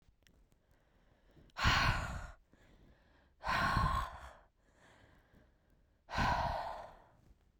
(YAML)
exhalation_length: 7.6 s
exhalation_amplitude: 4011
exhalation_signal_mean_std_ratio: 0.44
survey_phase: beta (2021-08-13 to 2022-03-07)
age: 18-44
gender: Female
wearing_mask: 'No'
symptom_none: true
smoker_status: Never smoked
respiratory_condition_asthma: false
respiratory_condition_other: false
recruitment_source: REACT
submission_delay: 1 day
covid_test_result: Negative
covid_test_method: RT-qPCR
influenza_a_test_result: Negative
influenza_b_test_result: Negative